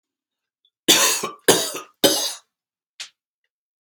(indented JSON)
{
  "three_cough_length": "3.8 s",
  "three_cough_amplitude": 32293,
  "three_cough_signal_mean_std_ratio": 0.36,
  "survey_phase": "beta (2021-08-13 to 2022-03-07)",
  "age": "18-44",
  "gender": "Male",
  "wearing_mask": "No",
  "symptom_none": true,
  "smoker_status": "Ex-smoker",
  "respiratory_condition_asthma": true,
  "respiratory_condition_other": false,
  "recruitment_source": "REACT",
  "submission_delay": "1 day",
  "covid_test_result": "Negative",
  "covid_test_method": "RT-qPCR",
  "influenza_a_test_result": "Negative",
  "influenza_b_test_result": "Negative"
}